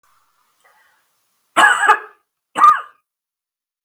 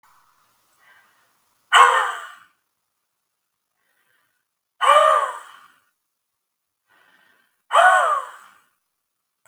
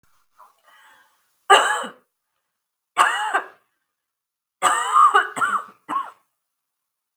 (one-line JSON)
{"cough_length": "3.8 s", "cough_amplitude": 32768, "cough_signal_mean_std_ratio": 0.32, "exhalation_length": "9.5 s", "exhalation_amplitude": 32768, "exhalation_signal_mean_std_ratio": 0.31, "three_cough_length": "7.2 s", "three_cough_amplitude": 32768, "three_cough_signal_mean_std_ratio": 0.37, "survey_phase": "beta (2021-08-13 to 2022-03-07)", "age": "45-64", "gender": "Female", "wearing_mask": "No", "symptom_none": true, "smoker_status": "Never smoked", "respiratory_condition_asthma": false, "respiratory_condition_other": false, "recruitment_source": "Test and Trace", "submission_delay": "0 days", "covid_test_result": "Negative", "covid_test_method": "LFT"}